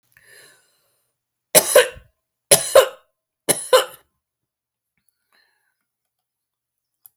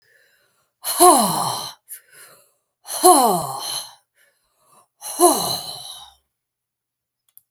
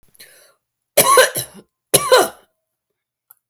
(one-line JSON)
{"three_cough_length": "7.2 s", "three_cough_amplitude": 32768, "three_cough_signal_mean_std_ratio": 0.23, "exhalation_length": "7.5 s", "exhalation_amplitude": 32767, "exhalation_signal_mean_std_ratio": 0.37, "cough_length": "3.5 s", "cough_amplitude": 32768, "cough_signal_mean_std_ratio": 0.35, "survey_phase": "alpha (2021-03-01 to 2021-08-12)", "age": "65+", "gender": "Female", "wearing_mask": "No", "symptom_none": true, "smoker_status": "Never smoked", "respiratory_condition_asthma": true, "respiratory_condition_other": false, "recruitment_source": "REACT", "submission_delay": "1 day", "covid_test_result": "Negative", "covid_test_method": "RT-qPCR"}